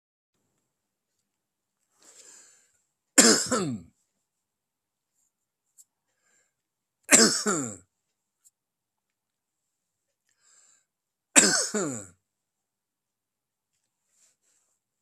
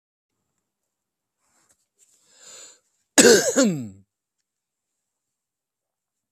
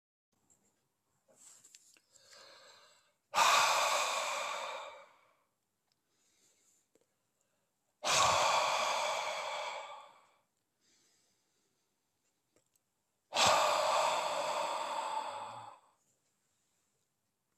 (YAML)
three_cough_length: 15.0 s
three_cough_amplitude: 32767
three_cough_signal_mean_std_ratio: 0.22
cough_length: 6.3 s
cough_amplitude: 32768
cough_signal_mean_std_ratio: 0.23
exhalation_length: 17.6 s
exhalation_amplitude: 6888
exhalation_signal_mean_std_ratio: 0.45
survey_phase: beta (2021-08-13 to 2022-03-07)
age: 65+
gender: Male
wearing_mask: 'No'
symptom_cough_any: true
smoker_status: Current smoker (1 to 10 cigarettes per day)
respiratory_condition_asthma: false
respiratory_condition_other: false
recruitment_source: REACT
submission_delay: 3 days
covid_test_result: Negative
covid_test_method: RT-qPCR
influenza_a_test_result: Negative
influenza_b_test_result: Negative